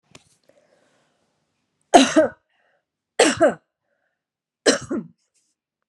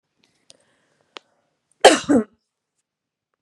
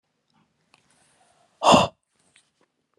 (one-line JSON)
{"three_cough_length": "5.9 s", "three_cough_amplitude": 32767, "three_cough_signal_mean_std_ratio": 0.27, "cough_length": "3.4 s", "cough_amplitude": 32768, "cough_signal_mean_std_ratio": 0.21, "exhalation_length": "3.0 s", "exhalation_amplitude": 24957, "exhalation_signal_mean_std_ratio": 0.22, "survey_phase": "beta (2021-08-13 to 2022-03-07)", "age": "45-64", "gender": "Female", "wearing_mask": "No", "symptom_none": true, "smoker_status": "Ex-smoker", "respiratory_condition_asthma": true, "respiratory_condition_other": false, "recruitment_source": "REACT", "submission_delay": "2 days", "covid_test_result": "Negative", "covid_test_method": "RT-qPCR", "influenza_a_test_result": "Negative", "influenza_b_test_result": "Negative"}